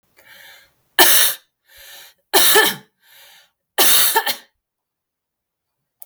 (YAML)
three_cough_length: 6.1 s
three_cough_amplitude: 32768
three_cough_signal_mean_std_ratio: 0.39
survey_phase: beta (2021-08-13 to 2022-03-07)
age: 18-44
gender: Female
wearing_mask: 'No'
symptom_none: true
smoker_status: Never smoked
respiratory_condition_asthma: false
respiratory_condition_other: false
recruitment_source: REACT
submission_delay: 1 day
covid_test_result: Negative
covid_test_method: RT-qPCR
influenza_a_test_result: Negative
influenza_b_test_result: Negative